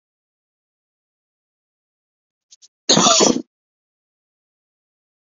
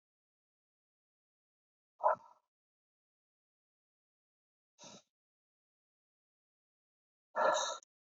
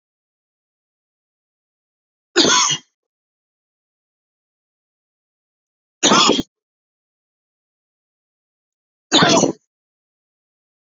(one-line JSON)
{"cough_length": "5.4 s", "cough_amplitude": 32096, "cough_signal_mean_std_ratio": 0.23, "exhalation_length": "8.1 s", "exhalation_amplitude": 4405, "exhalation_signal_mean_std_ratio": 0.2, "three_cough_length": "10.9 s", "three_cough_amplitude": 32767, "three_cough_signal_mean_std_ratio": 0.26, "survey_phase": "beta (2021-08-13 to 2022-03-07)", "age": "45-64", "gender": "Male", "wearing_mask": "No", "symptom_cough_any": true, "symptom_runny_or_blocked_nose": true, "symptom_fever_high_temperature": true, "symptom_headache": true, "smoker_status": "Never smoked", "respiratory_condition_asthma": false, "respiratory_condition_other": false, "recruitment_source": "Test and Trace", "submission_delay": "2 days", "covid_test_result": "Positive", "covid_test_method": "RT-qPCR", "covid_ct_value": 19.5, "covid_ct_gene": "ORF1ab gene", "covid_ct_mean": 20.1, "covid_viral_load": "260000 copies/ml", "covid_viral_load_category": "Low viral load (10K-1M copies/ml)"}